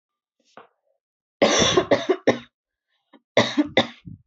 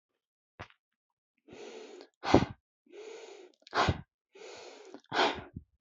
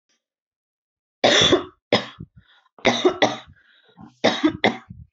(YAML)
cough_length: 4.3 s
cough_amplitude: 23865
cough_signal_mean_std_ratio: 0.39
exhalation_length: 5.8 s
exhalation_amplitude: 17677
exhalation_signal_mean_std_ratio: 0.3
three_cough_length: 5.1 s
three_cough_amplitude: 29556
three_cough_signal_mean_std_ratio: 0.39
survey_phase: beta (2021-08-13 to 2022-03-07)
age: 18-44
gender: Female
wearing_mask: 'No'
symptom_none: true
smoker_status: Never smoked
respiratory_condition_asthma: false
respiratory_condition_other: false
recruitment_source: REACT
submission_delay: 2 days
covid_test_result: Negative
covid_test_method: RT-qPCR